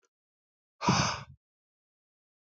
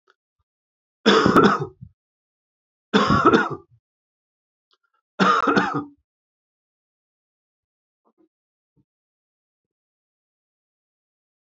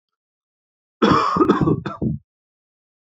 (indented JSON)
{
  "exhalation_length": "2.6 s",
  "exhalation_amplitude": 8597,
  "exhalation_signal_mean_std_ratio": 0.29,
  "three_cough_length": "11.4 s",
  "three_cough_amplitude": 26259,
  "three_cough_signal_mean_std_ratio": 0.3,
  "cough_length": "3.2 s",
  "cough_amplitude": 26132,
  "cough_signal_mean_std_ratio": 0.44,
  "survey_phase": "beta (2021-08-13 to 2022-03-07)",
  "age": "45-64",
  "gender": "Male",
  "wearing_mask": "No",
  "symptom_cough_any": true,
  "symptom_runny_or_blocked_nose": true,
  "symptom_fatigue": true,
  "symptom_headache": true,
  "symptom_loss_of_taste": true,
  "symptom_onset": "4 days",
  "smoker_status": "Never smoked",
  "respiratory_condition_asthma": false,
  "respiratory_condition_other": false,
  "recruitment_source": "Test and Trace",
  "submission_delay": "1 day",
  "covid_test_result": "Positive",
  "covid_test_method": "RT-qPCR"
}